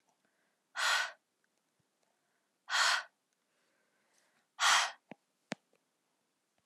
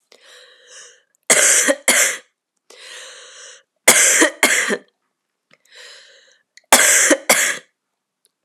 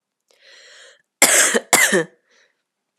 {
  "exhalation_length": "6.7 s",
  "exhalation_amplitude": 6262,
  "exhalation_signal_mean_std_ratio": 0.3,
  "three_cough_length": "8.4 s",
  "three_cough_amplitude": 32768,
  "three_cough_signal_mean_std_ratio": 0.42,
  "cough_length": "3.0 s",
  "cough_amplitude": 32768,
  "cough_signal_mean_std_ratio": 0.38,
  "survey_phase": "beta (2021-08-13 to 2022-03-07)",
  "age": "18-44",
  "gender": "Female",
  "wearing_mask": "No",
  "symptom_cough_any": true,
  "symptom_new_continuous_cough": true,
  "symptom_runny_or_blocked_nose": true,
  "symptom_sore_throat": true,
  "smoker_status": "Never smoked",
  "respiratory_condition_asthma": false,
  "respiratory_condition_other": false,
  "recruitment_source": "Test and Trace",
  "submission_delay": "2 days",
  "covid_test_result": "Positive",
  "covid_test_method": "RT-qPCR",
  "covid_ct_value": 27.1,
  "covid_ct_gene": "ORF1ab gene"
}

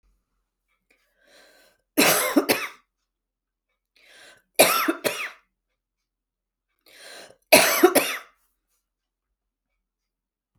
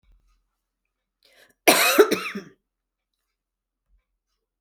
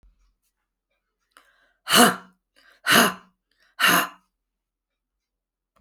{
  "three_cough_length": "10.6 s",
  "three_cough_amplitude": 32146,
  "three_cough_signal_mean_std_ratio": 0.29,
  "cough_length": "4.6 s",
  "cough_amplitude": 28368,
  "cough_signal_mean_std_ratio": 0.25,
  "exhalation_length": "5.8 s",
  "exhalation_amplitude": 30445,
  "exhalation_signal_mean_std_ratio": 0.28,
  "survey_phase": "beta (2021-08-13 to 2022-03-07)",
  "age": "45-64",
  "gender": "Female",
  "wearing_mask": "No",
  "symptom_cough_any": true,
  "symptom_change_to_sense_of_smell_or_taste": true,
  "symptom_onset": "4 days",
  "smoker_status": "Ex-smoker",
  "respiratory_condition_asthma": false,
  "respiratory_condition_other": false,
  "recruitment_source": "Test and Trace",
  "submission_delay": "2 days",
  "covid_test_result": "Positive",
  "covid_test_method": "RT-qPCR",
  "covid_ct_value": 18.4,
  "covid_ct_gene": "N gene",
  "covid_ct_mean": 19.3,
  "covid_viral_load": "480000 copies/ml",
  "covid_viral_load_category": "Low viral load (10K-1M copies/ml)"
}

